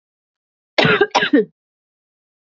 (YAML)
cough_length: 2.5 s
cough_amplitude: 30567
cough_signal_mean_std_ratio: 0.36
survey_phase: beta (2021-08-13 to 2022-03-07)
age: 18-44
gender: Female
wearing_mask: 'No'
symptom_cough_any: true
symptom_runny_or_blocked_nose: true
symptom_shortness_of_breath: true
symptom_onset: 5 days
smoker_status: Never smoked
respiratory_condition_asthma: false
respiratory_condition_other: false
recruitment_source: Test and Trace
submission_delay: 2 days
covid_test_result: Positive
covid_test_method: RT-qPCR
covid_ct_value: 29.5
covid_ct_gene: N gene